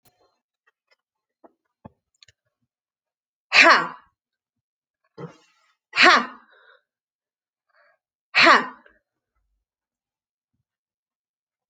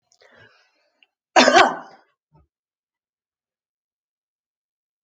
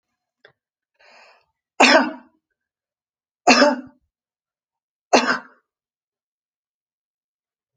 {"exhalation_length": "11.7 s", "exhalation_amplitude": 30863, "exhalation_signal_mean_std_ratio": 0.21, "cough_length": "5.0 s", "cough_amplitude": 29454, "cough_signal_mean_std_ratio": 0.21, "three_cough_length": "7.8 s", "three_cough_amplitude": 30497, "three_cough_signal_mean_std_ratio": 0.25, "survey_phase": "alpha (2021-03-01 to 2021-08-12)", "age": "65+", "gender": "Female", "wearing_mask": "No", "symptom_none": true, "smoker_status": "Never smoked", "respiratory_condition_asthma": false, "respiratory_condition_other": false, "recruitment_source": "REACT", "submission_delay": "2 days", "covid_test_result": "Negative", "covid_test_method": "RT-qPCR"}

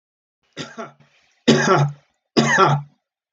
{"three_cough_length": "3.3 s", "three_cough_amplitude": 25352, "three_cough_signal_mean_std_ratio": 0.45, "survey_phase": "alpha (2021-03-01 to 2021-08-12)", "age": "45-64", "gender": "Male", "wearing_mask": "No", "symptom_none": true, "smoker_status": "Ex-smoker", "respiratory_condition_asthma": false, "respiratory_condition_other": false, "recruitment_source": "REACT", "submission_delay": "1 day", "covid_test_result": "Negative", "covid_test_method": "RT-qPCR"}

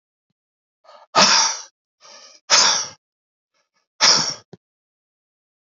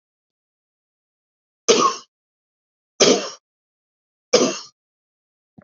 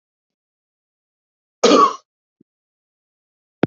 {"exhalation_length": "5.6 s", "exhalation_amplitude": 32723, "exhalation_signal_mean_std_ratio": 0.35, "three_cough_length": "5.6 s", "three_cough_amplitude": 30167, "three_cough_signal_mean_std_ratio": 0.27, "cough_length": "3.7 s", "cough_amplitude": 28397, "cough_signal_mean_std_ratio": 0.23, "survey_phase": "beta (2021-08-13 to 2022-03-07)", "age": "45-64", "gender": "Male", "wearing_mask": "No", "symptom_cough_any": true, "symptom_fatigue": true, "symptom_onset": "3 days", "smoker_status": "Never smoked", "respiratory_condition_asthma": false, "respiratory_condition_other": false, "recruitment_source": "Test and Trace", "submission_delay": "1 day", "covid_test_result": "Positive", "covid_test_method": "RT-qPCR", "covid_ct_value": 16.3, "covid_ct_gene": "N gene"}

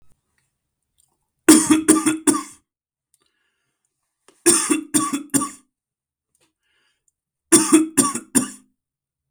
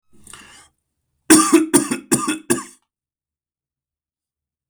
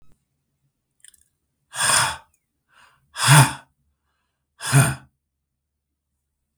{"three_cough_length": "9.3 s", "three_cough_amplitude": 32768, "three_cough_signal_mean_std_ratio": 0.35, "cough_length": "4.7 s", "cough_amplitude": 32768, "cough_signal_mean_std_ratio": 0.32, "exhalation_length": "6.6 s", "exhalation_amplitude": 32768, "exhalation_signal_mean_std_ratio": 0.29, "survey_phase": "beta (2021-08-13 to 2022-03-07)", "age": "45-64", "gender": "Male", "wearing_mask": "No", "symptom_none": true, "smoker_status": "Ex-smoker", "respiratory_condition_asthma": false, "respiratory_condition_other": false, "recruitment_source": "Test and Trace", "submission_delay": "1 day", "covid_test_result": "Positive", "covid_test_method": "RT-qPCR", "covid_ct_value": 19.2, "covid_ct_gene": "ORF1ab gene", "covid_ct_mean": 19.4, "covid_viral_load": "420000 copies/ml", "covid_viral_load_category": "Low viral load (10K-1M copies/ml)"}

